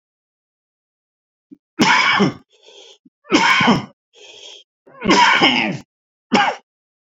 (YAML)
three_cough_length: 7.2 s
three_cough_amplitude: 29925
three_cough_signal_mean_std_ratio: 0.45
survey_phase: beta (2021-08-13 to 2022-03-07)
age: 65+
gender: Male
wearing_mask: 'No'
symptom_cough_any: true
symptom_onset: 2 days
smoker_status: Ex-smoker
respiratory_condition_asthma: true
respiratory_condition_other: false
recruitment_source: Test and Trace
submission_delay: 1 day
covid_test_result: Negative
covid_test_method: RT-qPCR